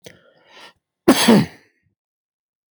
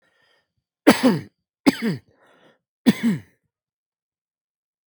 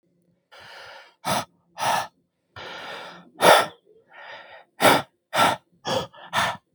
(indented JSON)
{
  "cough_length": "2.7 s",
  "cough_amplitude": 32766,
  "cough_signal_mean_std_ratio": 0.3,
  "three_cough_length": "4.9 s",
  "three_cough_amplitude": 32768,
  "three_cough_signal_mean_std_ratio": 0.28,
  "exhalation_length": "6.7 s",
  "exhalation_amplitude": 29998,
  "exhalation_signal_mean_std_ratio": 0.38,
  "survey_phase": "beta (2021-08-13 to 2022-03-07)",
  "age": "45-64",
  "gender": "Male",
  "wearing_mask": "No",
  "symptom_none": true,
  "smoker_status": "Ex-smoker",
  "respiratory_condition_asthma": false,
  "respiratory_condition_other": false,
  "recruitment_source": "REACT",
  "submission_delay": "1 day",
  "covid_test_result": "Negative",
  "covid_test_method": "RT-qPCR"
}